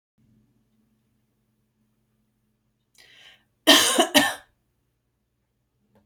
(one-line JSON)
{"three_cough_length": "6.1 s", "three_cough_amplitude": 31513, "three_cough_signal_mean_std_ratio": 0.23, "survey_phase": "beta (2021-08-13 to 2022-03-07)", "age": "45-64", "gender": "Female", "wearing_mask": "No", "symptom_none": true, "smoker_status": "Ex-smoker", "respiratory_condition_asthma": false, "respiratory_condition_other": false, "recruitment_source": "REACT", "submission_delay": "1 day", "covid_test_result": "Negative", "covid_test_method": "RT-qPCR"}